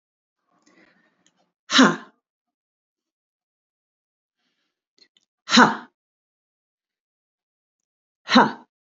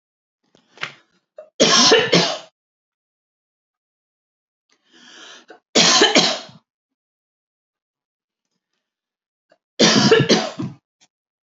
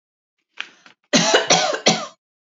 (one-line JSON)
{"exhalation_length": "9.0 s", "exhalation_amplitude": 27472, "exhalation_signal_mean_std_ratio": 0.2, "three_cough_length": "11.4 s", "three_cough_amplitude": 32434, "three_cough_signal_mean_std_ratio": 0.34, "cough_length": "2.6 s", "cough_amplitude": 28220, "cough_signal_mean_std_ratio": 0.44, "survey_phase": "alpha (2021-03-01 to 2021-08-12)", "age": "45-64", "gender": "Female", "wearing_mask": "No", "symptom_none": true, "smoker_status": "Never smoked", "respiratory_condition_asthma": false, "respiratory_condition_other": false, "recruitment_source": "REACT", "submission_delay": "1 day", "covid_test_result": "Negative", "covid_test_method": "RT-qPCR"}